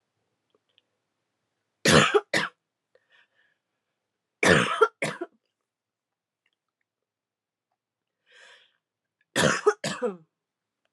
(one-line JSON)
{"three_cough_length": "10.9 s", "three_cough_amplitude": 23442, "three_cough_signal_mean_std_ratio": 0.27, "survey_phase": "alpha (2021-03-01 to 2021-08-12)", "age": "18-44", "gender": "Female", "wearing_mask": "No", "symptom_cough_any": true, "symptom_fatigue": true, "symptom_fever_high_temperature": true, "symptom_headache": true, "symptom_change_to_sense_of_smell_or_taste": true, "symptom_loss_of_taste": true, "smoker_status": "Current smoker (11 or more cigarettes per day)", "respiratory_condition_asthma": false, "respiratory_condition_other": false, "recruitment_source": "Test and Trace", "submission_delay": "2 days", "covid_test_result": "Positive", "covid_test_method": "LFT"}